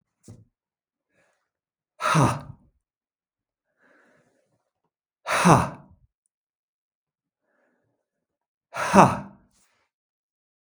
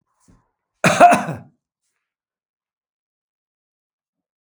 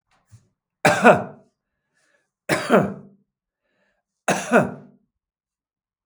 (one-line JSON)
{"exhalation_length": "10.7 s", "exhalation_amplitude": 32766, "exhalation_signal_mean_std_ratio": 0.24, "cough_length": "4.5 s", "cough_amplitude": 32766, "cough_signal_mean_std_ratio": 0.22, "three_cough_length": "6.1 s", "three_cough_amplitude": 32768, "three_cough_signal_mean_std_ratio": 0.31, "survey_phase": "beta (2021-08-13 to 2022-03-07)", "age": "65+", "gender": "Male", "wearing_mask": "No", "symptom_none": true, "smoker_status": "Never smoked", "respiratory_condition_asthma": false, "respiratory_condition_other": false, "recruitment_source": "REACT", "submission_delay": "3 days", "covid_test_result": "Negative", "covid_test_method": "RT-qPCR", "influenza_a_test_result": "Negative", "influenza_b_test_result": "Negative"}